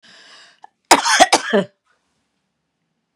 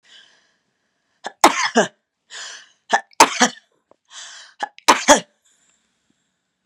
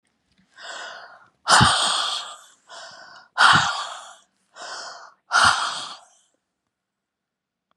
{"cough_length": "3.2 s", "cough_amplitude": 32768, "cough_signal_mean_std_ratio": 0.31, "three_cough_length": "6.7 s", "three_cough_amplitude": 32768, "three_cough_signal_mean_std_ratio": 0.27, "exhalation_length": "7.8 s", "exhalation_amplitude": 27699, "exhalation_signal_mean_std_ratio": 0.39, "survey_phase": "beta (2021-08-13 to 2022-03-07)", "age": "45-64", "gender": "Female", "wearing_mask": "No", "symptom_none": true, "smoker_status": "Ex-smoker", "respiratory_condition_asthma": true, "respiratory_condition_other": false, "recruitment_source": "Test and Trace", "submission_delay": "1 day", "covid_test_result": "Negative", "covid_test_method": "RT-qPCR"}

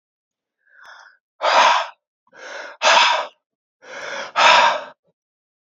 {"exhalation_length": "5.7 s", "exhalation_amplitude": 29049, "exhalation_signal_mean_std_ratio": 0.42, "survey_phase": "beta (2021-08-13 to 2022-03-07)", "age": "65+", "gender": "Male", "wearing_mask": "No", "symptom_cough_any": true, "symptom_runny_or_blocked_nose": true, "symptom_shortness_of_breath": true, "symptom_sore_throat": true, "symptom_change_to_sense_of_smell_or_taste": true, "symptom_loss_of_taste": true, "symptom_onset": "4 days", "smoker_status": "Ex-smoker", "respiratory_condition_asthma": false, "respiratory_condition_other": false, "recruitment_source": "Test and Trace", "submission_delay": "2 days", "covid_test_result": "Positive", "covid_test_method": "RT-qPCR", "covid_ct_value": 20.1, "covid_ct_gene": "ORF1ab gene"}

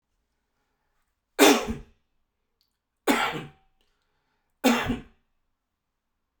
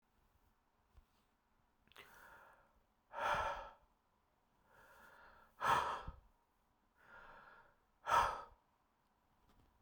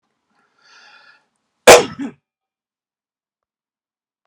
{"three_cough_length": "6.4 s", "three_cough_amplitude": 28325, "three_cough_signal_mean_std_ratio": 0.28, "exhalation_length": "9.8 s", "exhalation_amplitude": 2778, "exhalation_signal_mean_std_ratio": 0.31, "cough_length": "4.3 s", "cough_amplitude": 32768, "cough_signal_mean_std_ratio": 0.17, "survey_phase": "beta (2021-08-13 to 2022-03-07)", "age": "45-64", "gender": "Male", "wearing_mask": "No", "symptom_fatigue": true, "symptom_change_to_sense_of_smell_or_taste": true, "symptom_onset": "3 days", "smoker_status": "Ex-smoker", "respiratory_condition_asthma": false, "respiratory_condition_other": false, "recruitment_source": "Test and Trace", "submission_delay": "2 days", "covid_test_result": "Positive", "covid_test_method": "RT-qPCR", "covid_ct_value": 17.9, "covid_ct_gene": "ORF1ab gene", "covid_ct_mean": 18.6, "covid_viral_load": "770000 copies/ml", "covid_viral_load_category": "Low viral load (10K-1M copies/ml)"}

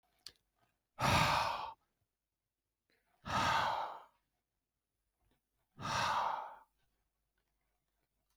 {"exhalation_length": "8.4 s", "exhalation_amplitude": 4045, "exhalation_signal_mean_std_ratio": 0.4, "survey_phase": "beta (2021-08-13 to 2022-03-07)", "age": "45-64", "gender": "Male", "wearing_mask": "No", "symptom_none": true, "symptom_onset": "12 days", "smoker_status": "Never smoked", "respiratory_condition_asthma": false, "respiratory_condition_other": false, "recruitment_source": "REACT", "submission_delay": "2 days", "covid_test_result": "Negative", "covid_test_method": "RT-qPCR"}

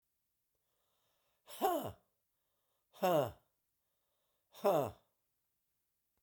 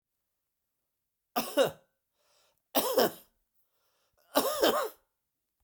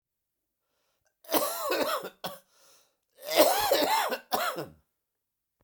{"exhalation_length": "6.2 s", "exhalation_amplitude": 3803, "exhalation_signal_mean_std_ratio": 0.29, "three_cough_length": "5.6 s", "three_cough_amplitude": 10140, "three_cough_signal_mean_std_ratio": 0.34, "cough_length": "5.6 s", "cough_amplitude": 14395, "cough_signal_mean_std_ratio": 0.47, "survey_phase": "beta (2021-08-13 to 2022-03-07)", "age": "65+", "gender": "Male", "wearing_mask": "No", "symptom_cough_any": true, "symptom_runny_or_blocked_nose": true, "symptom_abdominal_pain": true, "symptom_fatigue": true, "smoker_status": "Never smoked", "respiratory_condition_asthma": false, "respiratory_condition_other": false, "recruitment_source": "Test and Trace", "submission_delay": "2 days", "covid_test_result": "Positive", "covid_test_method": "LFT"}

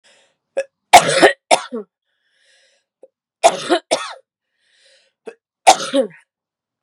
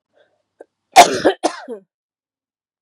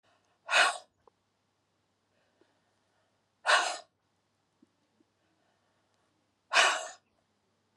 {"three_cough_length": "6.8 s", "three_cough_amplitude": 32768, "three_cough_signal_mean_std_ratio": 0.29, "cough_length": "2.8 s", "cough_amplitude": 32768, "cough_signal_mean_std_ratio": 0.26, "exhalation_length": "7.8 s", "exhalation_amplitude": 11302, "exhalation_signal_mean_std_ratio": 0.25, "survey_phase": "beta (2021-08-13 to 2022-03-07)", "age": "45-64", "gender": "Female", "wearing_mask": "No", "symptom_cough_any": true, "symptom_new_continuous_cough": true, "symptom_runny_or_blocked_nose": true, "symptom_shortness_of_breath": true, "symptom_sore_throat": true, "symptom_fatigue": true, "symptom_headache": true, "symptom_change_to_sense_of_smell_or_taste": true, "symptom_loss_of_taste": true, "symptom_onset": "2 days", "smoker_status": "Never smoked", "respiratory_condition_asthma": true, "respiratory_condition_other": false, "recruitment_source": "Test and Trace", "submission_delay": "2 days", "covid_test_result": "Positive", "covid_test_method": "RT-qPCR", "covid_ct_value": 24.3, "covid_ct_gene": "ORF1ab gene", "covid_ct_mean": 25.0, "covid_viral_load": "6500 copies/ml", "covid_viral_load_category": "Minimal viral load (< 10K copies/ml)"}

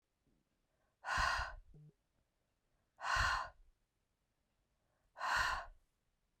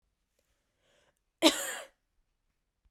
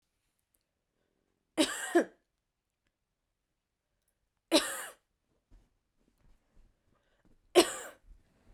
{"exhalation_length": "6.4 s", "exhalation_amplitude": 2472, "exhalation_signal_mean_std_ratio": 0.39, "cough_length": "2.9 s", "cough_amplitude": 14767, "cough_signal_mean_std_ratio": 0.2, "three_cough_length": "8.5 s", "three_cough_amplitude": 11571, "three_cough_signal_mean_std_ratio": 0.21, "survey_phase": "beta (2021-08-13 to 2022-03-07)", "age": "18-44", "gender": "Female", "wearing_mask": "No", "symptom_cough_any": true, "symptom_runny_or_blocked_nose": true, "symptom_sore_throat": true, "symptom_fatigue": true, "symptom_headache": true, "symptom_onset": "7 days", "smoker_status": "Never smoked", "respiratory_condition_asthma": false, "respiratory_condition_other": false, "recruitment_source": "Test and Trace", "submission_delay": "1 day", "covid_test_result": "Positive", "covid_test_method": "RT-qPCR", "covid_ct_value": 24.9, "covid_ct_gene": "ORF1ab gene"}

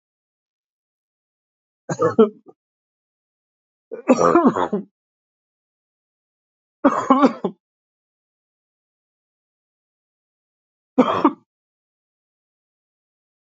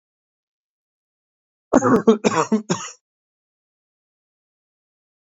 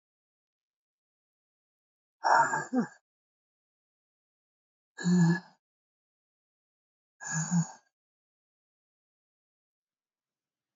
{"three_cough_length": "13.6 s", "three_cough_amplitude": 29237, "three_cough_signal_mean_std_ratio": 0.25, "cough_length": "5.4 s", "cough_amplitude": 27213, "cough_signal_mean_std_ratio": 0.27, "exhalation_length": "10.8 s", "exhalation_amplitude": 9479, "exhalation_signal_mean_std_ratio": 0.27, "survey_phase": "beta (2021-08-13 to 2022-03-07)", "age": "45-64", "gender": "Male", "wearing_mask": "No", "symptom_cough_any": true, "symptom_runny_or_blocked_nose": true, "symptom_shortness_of_breath": true, "symptom_sore_throat": true, "symptom_abdominal_pain": true, "symptom_fatigue": true, "symptom_fever_high_temperature": true, "symptom_headache": true, "symptom_change_to_sense_of_smell_or_taste": true, "symptom_other": true, "symptom_onset": "3 days", "smoker_status": "Never smoked", "respiratory_condition_asthma": false, "respiratory_condition_other": false, "recruitment_source": "Test and Trace", "submission_delay": "2 days", "covid_test_result": "Positive", "covid_test_method": "RT-qPCR", "covid_ct_value": 16.7, "covid_ct_gene": "ORF1ab gene", "covid_ct_mean": 17.2, "covid_viral_load": "2200000 copies/ml", "covid_viral_load_category": "High viral load (>1M copies/ml)"}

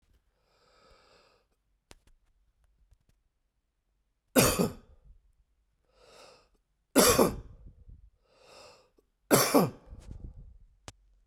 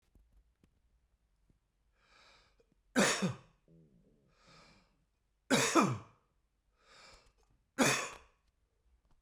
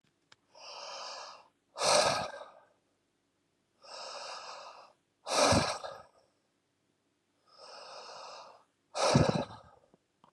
{"cough_length": "11.3 s", "cough_amplitude": 17893, "cough_signal_mean_std_ratio": 0.26, "three_cough_length": "9.2 s", "three_cough_amplitude": 7229, "three_cough_signal_mean_std_ratio": 0.28, "exhalation_length": "10.3 s", "exhalation_amplitude": 8491, "exhalation_signal_mean_std_ratio": 0.37, "survey_phase": "beta (2021-08-13 to 2022-03-07)", "age": "65+", "gender": "Male", "wearing_mask": "No", "symptom_none": true, "smoker_status": "Ex-smoker", "respiratory_condition_asthma": false, "respiratory_condition_other": false, "recruitment_source": "REACT", "submission_delay": "1 day", "covid_test_result": "Negative", "covid_test_method": "RT-qPCR", "influenza_a_test_result": "Negative", "influenza_b_test_result": "Negative"}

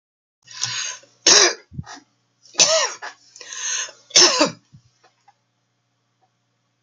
{"three_cough_length": "6.8 s", "three_cough_amplitude": 32663, "three_cough_signal_mean_std_ratio": 0.35, "survey_phase": "beta (2021-08-13 to 2022-03-07)", "age": "45-64", "gender": "Female", "wearing_mask": "No", "symptom_sore_throat": true, "smoker_status": "Never smoked", "respiratory_condition_asthma": false, "respiratory_condition_other": false, "recruitment_source": "Test and Trace", "submission_delay": "2 days", "covid_test_result": "Positive", "covid_test_method": "RT-qPCR", "covid_ct_value": 37.5, "covid_ct_gene": "N gene"}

